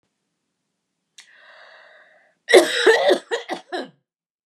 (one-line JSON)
{"cough_length": "4.5 s", "cough_amplitude": 32767, "cough_signal_mean_std_ratio": 0.32, "survey_phase": "beta (2021-08-13 to 2022-03-07)", "age": "65+", "gender": "Female", "wearing_mask": "No", "symptom_none": true, "smoker_status": "Never smoked", "respiratory_condition_asthma": false, "respiratory_condition_other": true, "recruitment_source": "REACT", "submission_delay": "5 days", "covid_test_result": "Negative", "covid_test_method": "RT-qPCR", "influenza_a_test_result": "Negative", "influenza_b_test_result": "Negative"}